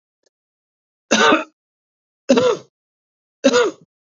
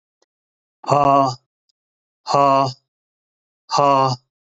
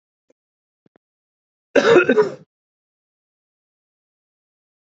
{
  "three_cough_length": "4.2 s",
  "three_cough_amplitude": 30915,
  "three_cough_signal_mean_std_ratio": 0.37,
  "exhalation_length": "4.5 s",
  "exhalation_amplitude": 27642,
  "exhalation_signal_mean_std_ratio": 0.41,
  "cough_length": "4.9 s",
  "cough_amplitude": 28010,
  "cough_signal_mean_std_ratio": 0.25,
  "survey_phase": "beta (2021-08-13 to 2022-03-07)",
  "age": "45-64",
  "gender": "Male",
  "wearing_mask": "No",
  "symptom_sore_throat": true,
  "symptom_diarrhoea": true,
  "symptom_fever_high_temperature": true,
  "symptom_headache": true,
  "symptom_loss_of_taste": true,
  "smoker_status": "Never smoked",
  "respiratory_condition_asthma": true,
  "respiratory_condition_other": false,
  "recruitment_source": "Test and Trace",
  "submission_delay": "0 days",
  "covid_test_result": "Positive",
  "covid_test_method": "LFT"
}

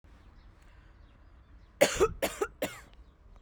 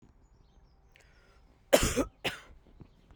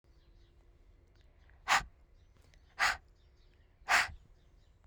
{
  "three_cough_length": "3.4 s",
  "three_cough_amplitude": 12068,
  "three_cough_signal_mean_std_ratio": 0.33,
  "cough_length": "3.2 s",
  "cough_amplitude": 14887,
  "cough_signal_mean_std_ratio": 0.28,
  "exhalation_length": "4.9 s",
  "exhalation_amplitude": 6372,
  "exhalation_signal_mean_std_ratio": 0.29,
  "survey_phase": "beta (2021-08-13 to 2022-03-07)",
  "age": "18-44",
  "gender": "Female",
  "wearing_mask": "No",
  "symptom_none": true,
  "symptom_onset": "8 days",
  "smoker_status": "Never smoked",
  "respiratory_condition_asthma": false,
  "respiratory_condition_other": true,
  "recruitment_source": "REACT",
  "submission_delay": "2 days",
  "covid_test_result": "Negative",
  "covid_test_method": "RT-qPCR",
  "influenza_a_test_result": "Negative",
  "influenza_b_test_result": "Negative"
}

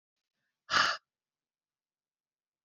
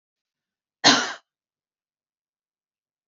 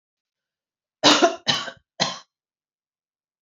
{
  "exhalation_length": "2.6 s",
  "exhalation_amplitude": 7183,
  "exhalation_signal_mean_std_ratio": 0.23,
  "cough_length": "3.1 s",
  "cough_amplitude": 29085,
  "cough_signal_mean_std_ratio": 0.2,
  "three_cough_length": "3.4 s",
  "three_cough_amplitude": 27933,
  "three_cough_signal_mean_std_ratio": 0.3,
  "survey_phase": "beta (2021-08-13 to 2022-03-07)",
  "age": "45-64",
  "gender": "Female",
  "wearing_mask": "No",
  "symptom_none": true,
  "smoker_status": "Ex-smoker",
  "respiratory_condition_asthma": false,
  "respiratory_condition_other": false,
  "recruitment_source": "REACT",
  "submission_delay": "2 days",
  "covid_test_result": "Negative",
  "covid_test_method": "RT-qPCR",
  "influenza_a_test_result": "Negative",
  "influenza_b_test_result": "Negative"
}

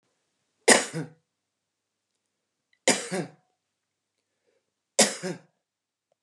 {
  "three_cough_length": "6.2 s",
  "three_cough_amplitude": 28985,
  "three_cough_signal_mean_std_ratio": 0.23,
  "survey_phase": "beta (2021-08-13 to 2022-03-07)",
  "age": "45-64",
  "gender": "Female",
  "wearing_mask": "No",
  "symptom_none": true,
  "smoker_status": "Current smoker (11 or more cigarettes per day)",
  "respiratory_condition_asthma": false,
  "respiratory_condition_other": false,
  "recruitment_source": "REACT",
  "submission_delay": "1 day",
  "covid_test_result": "Negative",
  "covid_test_method": "RT-qPCR"
}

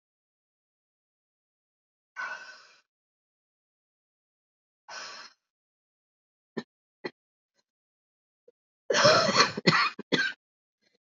{
  "exhalation_length": "11.1 s",
  "exhalation_amplitude": 18563,
  "exhalation_signal_mean_std_ratio": 0.26,
  "survey_phase": "beta (2021-08-13 to 2022-03-07)",
  "age": "18-44",
  "gender": "Female",
  "wearing_mask": "No",
  "symptom_cough_any": true,
  "symptom_new_continuous_cough": true,
  "symptom_runny_or_blocked_nose": true,
  "symptom_shortness_of_breath": true,
  "symptom_sore_throat": true,
  "symptom_fatigue": true,
  "symptom_fever_high_temperature": true,
  "symptom_headache": true,
  "symptom_change_to_sense_of_smell_or_taste": true,
  "symptom_other": true,
  "symptom_onset": "3 days",
  "smoker_status": "Ex-smoker",
  "respiratory_condition_asthma": false,
  "respiratory_condition_other": false,
  "recruitment_source": "Test and Trace",
  "submission_delay": "2 days",
  "covid_test_result": "Positive",
  "covid_test_method": "RT-qPCR"
}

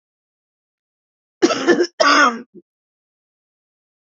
{
  "cough_length": "4.1 s",
  "cough_amplitude": 27960,
  "cough_signal_mean_std_ratio": 0.34,
  "survey_phase": "beta (2021-08-13 to 2022-03-07)",
  "age": "65+",
  "gender": "Female",
  "wearing_mask": "No",
  "symptom_none": true,
  "smoker_status": "Never smoked",
  "respiratory_condition_asthma": true,
  "respiratory_condition_other": false,
  "recruitment_source": "REACT",
  "submission_delay": "2 days",
  "covid_test_result": "Negative",
  "covid_test_method": "RT-qPCR",
  "influenza_a_test_result": "Negative",
  "influenza_b_test_result": "Negative"
}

